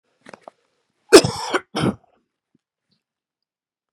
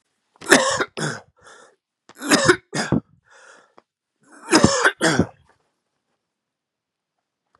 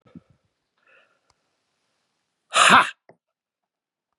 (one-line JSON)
{"cough_length": "3.9 s", "cough_amplitude": 32768, "cough_signal_mean_std_ratio": 0.21, "three_cough_length": "7.6 s", "three_cough_amplitude": 32768, "three_cough_signal_mean_std_ratio": 0.34, "exhalation_length": "4.2 s", "exhalation_amplitude": 30624, "exhalation_signal_mean_std_ratio": 0.22, "survey_phase": "beta (2021-08-13 to 2022-03-07)", "age": "65+", "gender": "Male", "wearing_mask": "No", "symptom_runny_or_blocked_nose": true, "symptom_fatigue": true, "symptom_fever_high_temperature": true, "symptom_headache": true, "symptom_change_to_sense_of_smell_or_taste": true, "symptom_onset": "5 days", "smoker_status": "Ex-smoker", "respiratory_condition_asthma": false, "respiratory_condition_other": false, "recruitment_source": "Test and Trace", "submission_delay": "2 days", "covid_test_result": "Positive", "covid_test_method": "RT-qPCR", "covid_ct_value": 14.9, "covid_ct_gene": "ORF1ab gene", "covid_ct_mean": 15.1, "covid_viral_load": "11000000 copies/ml", "covid_viral_load_category": "High viral load (>1M copies/ml)"}